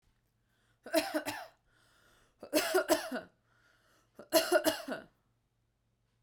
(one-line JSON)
{"cough_length": "6.2 s", "cough_amplitude": 7503, "cough_signal_mean_std_ratio": 0.36, "survey_phase": "beta (2021-08-13 to 2022-03-07)", "age": "18-44", "gender": "Female", "wearing_mask": "No", "symptom_runny_or_blocked_nose": true, "symptom_sore_throat": true, "smoker_status": "Never smoked", "respiratory_condition_asthma": false, "respiratory_condition_other": false, "recruitment_source": "REACT", "submission_delay": "1 day", "covid_test_result": "Negative", "covid_test_method": "RT-qPCR"}